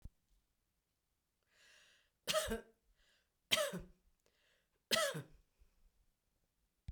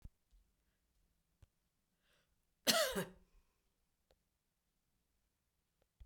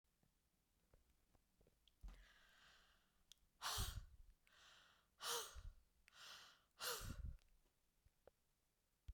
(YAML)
three_cough_length: 6.9 s
three_cough_amplitude: 4981
three_cough_signal_mean_std_ratio: 0.29
cough_length: 6.1 s
cough_amplitude: 4796
cough_signal_mean_std_ratio: 0.2
exhalation_length: 9.1 s
exhalation_amplitude: 719
exhalation_signal_mean_std_ratio: 0.4
survey_phase: beta (2021-08-13 to 2022-03-07)
age: 65+
gender: Female
wearing_mask: 'No'
symptom_none: true
smoker_status: Never smoked
respiratory_condition_asthma: false
respiratory_condition_other: false
recruitment_source: Test and Trace
submission_delay: 2 days
covid_test_result: Negative
covid_test_method: RT-qPCR